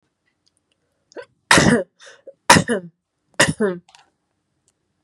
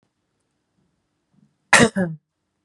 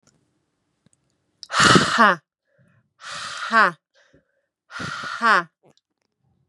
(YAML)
three_cough_length: 5.0 s
three_cough_amplitude: 32768
three_cough_signal_mean_std_ratio: 0.31
cough_length: 2.6 s
cough_amplitude: 32767
cough_signal_mean_std_ratio: 0.25
exhalation_length: 6.5 s
exhalation_amplitude: 32179
exhalation_signal_mean_std_ratio: 0.33
survey_phase: beta (2021-08-13 to 2022-03-07)
age: 18-44
gender: Female
wearing_mask: 'No'
symptom_none: true
smoker_status: Ex-smoker
respiratory_condition_asthma: false
respiratory_condition_other: false
recruitment_source: REACT
submission_delay: 3 days
covid_test_result: Negative
covid_test_method: RT-qPCR
influenza_a_test_result: Negative
influenza_b_test_result: Negative